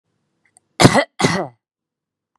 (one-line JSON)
{"cough_length": "2.4 s", "cough_amplitude": 32768, "cough_signal_mean_std_ratio": 0.3, "survey_phase": "beta (2021-08-13 to 2022-03-07)", "age": "18-44", "gender": "Female", "wearing_mask": "No", "symptom_none": true, "smoker_status": "Ex-smoker", "respiratory_condition_asthma": false, "respiratory_condition_other": false, "recruitment_source": "REACT", "submission_delay": "2 days", "covid_test_result": "Negative", "covid_test_method": "RT-qPCR", "influenza_a_test_result": "Negative", "influenza_b_test_result": "Negative"}